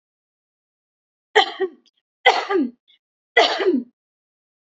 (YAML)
three_cough_length: 4.6 s
three_cough_amplitude: 32100
three_cough_signal_mean_std_ratio: 0.36
survey_phase: beta (2021-08-13 to 2022-03-07)
age: 18-44
gender: Female
wearing_mask: 'No'
symptom_none: true
smoker_status: Never smoked
respiratory_condition_asthma: false
respiratory_condition_other: false
recruitment_source: REACT
submission_delay: 2 days
covid_test_result: Negative
covid_test_method: RT-qPCR
influenza_a_test_result: Negative
influenza_b_test_result: Negative